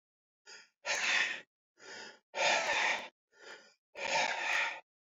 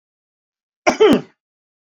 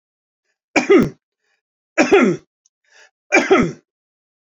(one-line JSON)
{"exhalation_length": "5.1 s", "exhalation_amplitude": 4428, "exhalation_signal_mean_std_ratio": 0.56, "cough_length": "1.9 s", "cough_amplitude": 27481, "cough_signal_mean_std_ratio": 0.31, "three_cough_length": "4.5 s", "three_cough_amplitude": 31766, "three_cough_signal_mean_std_ratio": 0.38, "survey_phase": "beta (2021-08-13 to 2022-03-07)", "age": "65+", "gender": "Male", "wearing_mask": "No", "symptom_none": true, "smoker_status": "Ex-smoker", "respiratory_condition_asthma": false, "respiratory_condition_other": false, "recruitment_source": "REACT", "submission_delay": "1 day", "covid_test_result": "Negative", "covid_test_method": "RT-qPCR", "influenza_a_test_result": "Negative", "influenza_b_test_result": "Negative"}